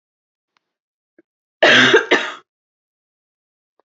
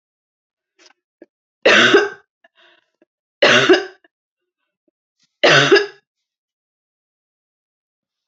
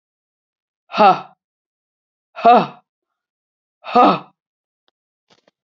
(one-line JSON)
{"cough_length": "3.8 s", "cough_amplitude": 29970, "cough_signal_mean_std_ratio": 0.31, "three_cough_length": "8.3 s", "three_cough_amplitude": 29550, "three_cough_signal_mean_std_ratio": 0.31, "exhalation_length": "5.6 s", "exhalation_amplitude": 29478, "exhalation_signal_mean_std_ratio": 0.28, "survey_phase": "beta (2021-08-13 to 2022-03-07)", "age": "45-64", "gender": "Female", "wearing_mask": "No", "symptom_new_continuous_cough": true, "symptom_onset": "2 days", "smoker_status": "Never smoked", "respiratory_condition_asthma": false, "respiratory_condition_other": false, "recruitment_source": "Test and Trace", "submission_delay": "1 day", "covid_test_result": "Negative", "covid_test_method": "ePCR"}